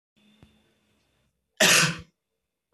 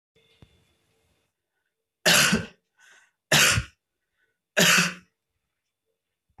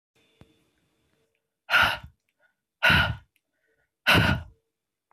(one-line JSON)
{"cough_length": "2.7 s", "cough_amplitude": 19044, "cough_signal_mean_std_ratio": 0.28, "three_cough_length": "6.4 s", "three_cough_amplitude": 19098, "three_cough_signal_mean_std_ratio": 0.32, "exhalation_length": "5.1 s", "exhalation_amplitude": 14281, "exhalation_signal_mean_std_ratio": 0.34, "survey_phase": "beta (2021-08-13 to 2022-03-07)", "age": "18-44", "gender": "Female", "wearing_mask": "No", "symptom_cough_any": true, "symptom_runny_or_blocked_nose": true, "symptom_sore_throat": true, "symptom_fatigue": true, "symptom_other": true, "symptom_onset": "6 days", "smoker_status": "Never smoked", "respiratory_condition_asthma": false, "respiratory_condition_other": false, "recruitment_source": "Test and Trace", "submission_delay": "2 days", "covid_test_result": "Positive", "covid_test_method": "RT-qPCR", "covid_ct_value": 34.2, "covid_ct_gene": "ORF1ab gene"}